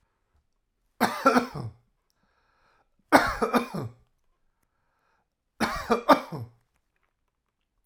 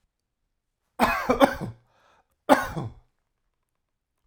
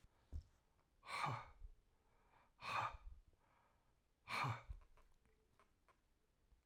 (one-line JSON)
{"three_cough_length": "7.9 s", "three_cough_amplitude": 23283, "three_cough_signal_mean_std_ratio": 0.31, "cough_length": "4.3 s", "cough_amplitude": 31592, "cough_signal_mean_std_ratio": 0.31, "exhalation_length": "6.7 s", "exhalation_amplitude": 985, "exhalation_signal_mean_std_ratio": 0.4, "survey_phase": "alpha (2021-03-01 to 2021-08-12)", "age": "45-64", "gender": "Male", "wearing_mask": "No", "symptom_none": true, "smoker_status": "Never smoked", "respiratory_condition_asthma": false, "respiratory_condition_other": false, "recruitment_source": "REACT", "submission_delay": "1 day", "covid_test_result": "Negative", "covid_test_method": "RT-qPCR"}